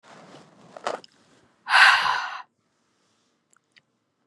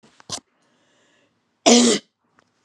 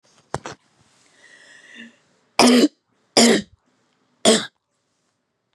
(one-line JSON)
{"exhalation_length": "4.3 s", "exhalation_amplitude": 27111, "exhalation_signal_mean_std_ratio": 0.3, "cough_length": "2.6 s", "cough_amplitude": 31099, "cough_signal_mean_std_ratio": 0.3, "three_cough_length": "5.5 s", "three_cough_amplitude": 32768, "three_cough_signal_mean_std_ratio": 0.3, "survey_phase": "beta (2021-08-13 to 2022-03-07)", "age": "18-44", "gender": "Female", "wearing_mask": "No", "symptom_cough_any": true, "symptom_diarrhoea": true, "symptom_fatigue": true, "symptom_headache": true, "symptom_onset": "3 days", "smoker_status": "Never smoked", "respiratory_condition_asthma": false, "respiratory_condition_other": false, "recruitment_source": "Test and Trace", "submission_delay": "1 day", "covid_test_result": "Positive", "covid_test_method": "RT-qPCR", "covid_ct_value": 25.9, "covid_ct_gene": "N gene"}